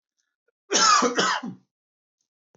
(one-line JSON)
{"cough_length": "2.6 s", "cough_amplitude": 16479, "cough_signal_mean_std_ratio": 0.43, "survey_phase": "beta (2021-08-13 to 2022-03-07)", "age": "18-44", "gender": "Male", "wearing_mask": "No", "symptom_none": true, "smoker_status": "Never smoked", "respiratory_condition_asthma": false, "respiratory_condition_other": false, "recruitment_source": "REACT", "submission_delay": "2 days", "covid_test_result": "Negative", "covid_test_method": "RT-qPCR", "influenza_a_test_result": "Negative", "influenza_b_test_result": "Negative"}